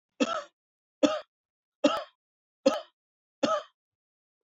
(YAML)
cough_length: 4.4 s
cough_amplitude: 12253
cough_signal_mean_std_ratio: 0.31
survey_phase: beta (2021-08-13 to 2022-03-07)
age: 45-64
gender: Male
wearing_mask: 'No'
symptom_none: true
smoker_status: Never smoked
respiratory_condition_asthma: false
respiratory_condition_other: false
recruitment_source: REACT
submission_delay: 1 day
covid_test_result: Negative
covid_test_method: RT-qPCR